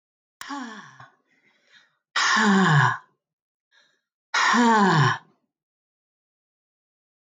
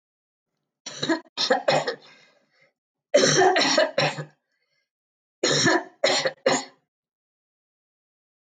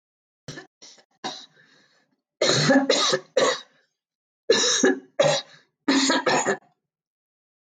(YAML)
exhalation_length: 7.3 s
exhalation_amplitude: 15945
exhalation_signal_mean_std_ratio: 0.42
three_cough_length: 8.4 s
three_cough_amplitude: 17717
three_cough_signal_mean_std_ratio: 0.44
cough_length: 7.8 s
cough_amplitude: 16243
cough_signal_mean_std_ratio: 0.47
survey_phase: alpha (2021-03-01 to 2021-08-12)
age: 65+
gender: Female
wearing_mask: 'No'
symptom_none: true
smoker_status: Ex-smoker
respiratory_condition_asthma: false
respiratory_condition_other: false
recruitment_source: REACT
submission_delay: 2 days
covid_test_result: Negative
covid_test_method: RT-qPCR